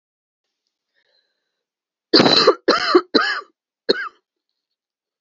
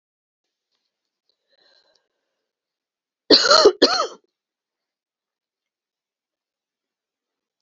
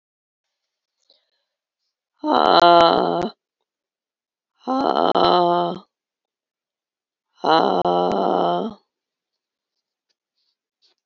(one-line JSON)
{"three_cough_length": "5.2 s", "three_cough_amplitude": 31618, "three_cough_signal_mean_std_ratio": 0.34, "cough_length": "7.6 s", "cough_amplitude": 32768, "cough_signal_mean_std_ratio": 0.21, "exhalation_length": "11.1 s", "exhalation_amplitude": 27716, "exhalation_signal_mean_std_ratio": 0.37, "survey_phase": "alpha (2021-03-01 to 2021-08-12)", "age": "45-64", "gender": "Female", "wearing_mask": "No", "symptom_cough_any": true, "symptom_new_continuous_cough": true, "symptom_abdominal_pain": true, "symptom_fatigue": true, "symptom_headache": true, "symptom_onset": "5 days", "smoker_status": "Never smoked", "respiratory_condition_asthma": true, "respiratory_condition_other": false, "recruitment_source": "Test and Trace", "submission_delay": "1 day", "covid_test_result": "Positive", "covid_test_method": "RT-qPCR", "covid_ct_value": 30.9, "covid_ct_gene": "ORF1ab gene"}